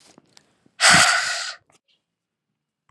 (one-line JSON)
{"exhalation_length": "2.9 s", "exhalation_amplitude": 30937, "exhalation_signal_mean_std_ratio": 0.35, "survey_phase": "alpha (2021-03-01 to 2021-08-12)", "age": "45-64", "gender": "Female", "wearing_mask": "No", "symptom_cough_any": true, "symptom_fatigue": true, "symptom_headache": true, "symptom_change_to_sense_of_smell_or_taste": true, "symptom_onset": "5 days", "smoker_status": "Never smoked", "respiratory_condition_asthma": false, "respiratory_condition_other": false, "recruitment_source": "Test and Trace", "submission_delay": "2 days", "covid_test_result": "Positive", "covid_test_method": "RT-qPCR", "covid_ct_value": 15.6, "covid_ct_gene": "N gene", "covid_ct_mean": 15.7, "covid_viral_load": "6900000 copies/ml", "covid_viral_load_category": "High viral load (>1M copies/ml)"}